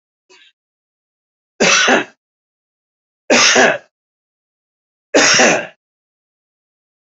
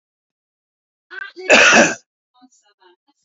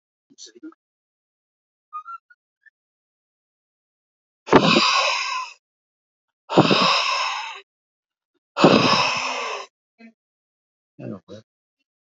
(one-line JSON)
{"three_cough_length": "7.1 s", "three_cough_amplitude": 32768, "three_cough_signal_mean_std_ratio": 0.37, "cough_length": "3.2 s", "cough_amplitude": 30082, "cough_signal_mean_std_ratio": 0.32, "exhalation_length": "12.0 s", "exhalation_amplitude": 32768, "exhalation_signal_mean_std_ratio": 0.37, "survey_phase": "alpha (2021-03-01 to 2021-08-12)", "age": "45-64", "gender": "Male", "wearing_mask": "No", "symptom_none": true, "smoker_status": "Current smoker (11 or more cigarettes per day)", "respiratory_condition_asthma": false, "respiratory_condition_other": false, "recruitment_source": "REACT", "submission_delay": "6 days", "covid_test_result": "Negative", "covid_test_method": "RT-qPCR"}